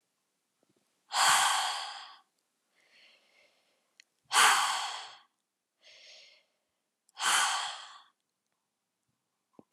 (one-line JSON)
{"exhalation_length": "9.7 s", "exhalation_amplitude": 10117, "exhalation_signal_mean_std_ratio": 0.35, "survey_phase": "beta (2021-08-13 to 2022-03-07)", "age": "18-44", "gender": "Female", "wearing_mask": "No", "symptom_cough_any": true, "symptom_runny_or_blocked_nose": true, "symptom_sore_throat": true, "symptom_fatigue": true, "smoker_status": "Never smoked", "respiratory_condition_asthma": false, "respiratory_condition_other": false, "recruitment_source": "Test and Trace", "submission_delay": "0 days", "covid_test_result": "Positive", "covid_test_method": "RT-qPCR", "covid_ct_value": 25.9, "covid_ct_gene": "ORF1ab gene"}